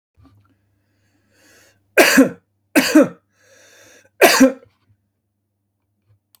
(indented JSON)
{
  "three_cough_length": "6.4 s",
  "three_cough_amplitude": 32768,
  "three_cough_signal_mean_std_ratio": 0.3,
  "survey_phase": "beta (2021-08-13 to 2022-03-07)",
  "age": "45-64",
  "gender": "Male",
  "wearing_mask": "No",
  "symptom_none": true,
  "smoker_status": "Ex-smoker",
  "respiratory_condition_asthma": false,
  "respiratory_condition_other": false,
  "recruitment_source": "REACT",
  "submission_delay": "2 days",
  "covid_test_result": "Negative",
  "covid_test_method": "RT-qPCR",
  "influenza_a_test_result": "Negative",
  "influenza_b_test_result": "Negative"
}